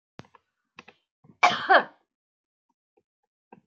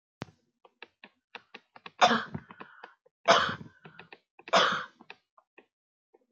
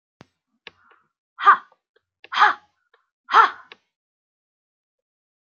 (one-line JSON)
{"cough_length": "3.7 s", "cough_amplitude": 25151, "cough_signal_mean_std_ratio": 0.22, "three_cough_length": "6.3 s", "three_cough_amplitude": 15566, "three_cough_signal_mean_std_ratio": 0.28, "exhalation_length": "5.5 s", "exhalation_amplitude": 27647, "exhalation_signal_mean_std_ratio": 0.23, "survey_phase": "beta (2021-08-13 to 2022-03-07)", "age": "18-44", "gender": "Female", "wearing_mask": "No", "symptom_none": true, "symptom_onset": "12 days", "smoker_status": "Ex-smoker", "respiratory_condition_asthma": false, "respiratory_condition_other": false, "recruitment_source": "REACT", "submission_delay": "1 day", "covid_test_result": "Negative", "covid_test_method": "RT-qPCR", "influenza_a_test_result": "Negative", "influenza_b_test_result": "Negative"}